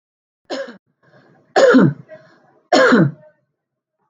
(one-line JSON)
{"three_cough_length": "4.1 s", "three_cough_amplitude": 27030, "three_cough_signal_mean_std_ratio": 0.39, "survey_phase": "alpha (2021-03-01 to 2021-08-12)", "age": "45-64", "gender": "Female", "wearing_mask": "No", "symptom_none": true, "smoker_status": "Ex-smoker", "respiratory_condition_asthma": false, "respiratory_condition_other": false, "recruitment_source": "REACT", "submission_delay": "3 days", "covid_test_result": "Negative", "covid_test_method": "RT-qPCR"}